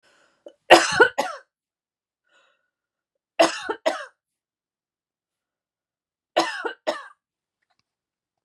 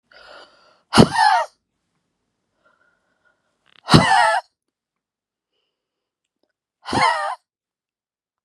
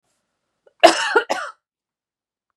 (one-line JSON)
{"three_cough_length": "8.4 s", "three_cough_amplitude": 32768, "three_cough_signal_mean_std_ratio": 0.24, "exhalation_length": "8.4 s", "exhalation_amplitude": 32768, "exhalation_signal_mean_std_ratio": 0.3, "cough_length": "2.6 s", "cough_amplitude": 32768, "cough_signal_mean_std_ratio": 0.28, "survey_phase": "beta (2021-08-13 to 2022-03-07)", "age": "45-64", "gender": "Female", "wearing_mask": "No", "symptom_none": true, "smoker_status": "Ex-smoker", "respiratory_condition_asthma": false, "respiratory_condition_other": false, "recruitment_source": "REACT", "submission_delay": "2 days", "covid_test_result": "Negative", "covid_test_method": "RT-qPCR", "influenza_a_test_result": "Negative", "influenza_b_test_result": "Negative"}